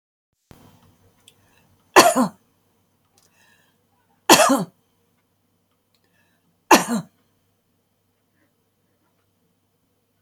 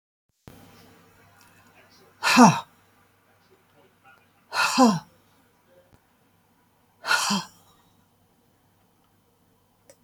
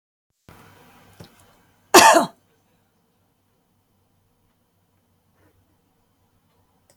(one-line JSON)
{"three_cough_length": "10.2 s", "three_cough_amplitude": 32768, "three_cough_signal_mean_std_ratio": 0.21, "exhalation_length": "10.0 s", "exhalation_amplitude": 26337, "exhalation_signal_mean_std_ratio": 0.25, "cough_length": "7.0 s", "cough_amplitude": 32768, "cough_signal_mean_std_ratio": 0.17, "survey_phase": "alpha (2021-03-01 to 2021-08-12)", "age": "65+", "gender": "Female", "wearing_mask": "No", "symptom_none": true, "smoker_status": "Never smoked", "respiratory_condition_asthma": false, "respiratory_condition_other": false, "recruitment_source": "REACT", "submission_delay": "1 day", "covid_test_result": "Negative", "covid_test_method": "RT-qPCR"}